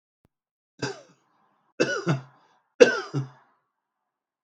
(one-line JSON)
{"three_cough_length": "4.4 s", "three_cough_amplitude": 32768, "three_cough_signal_mean_std_ratio": 0.25, "survey_phase": "beta (2021-08-13 to 2022-03-07)", "age": "45-64", "gender": "Male", "wearing_mask": "No", "symptom_none": true, "smoker_status": "Ex-smoker", "respiratory_condition_asthma": false, "respiratory_condition_other": false, "recruitment_source": "REACT", "submission_delay": "0 days", "covid_test_result": "Negative", "covid_test_method": "RT-qPCR", "influenza_a_test_result": "Negative", "influenza_b_test_result": "Negative"}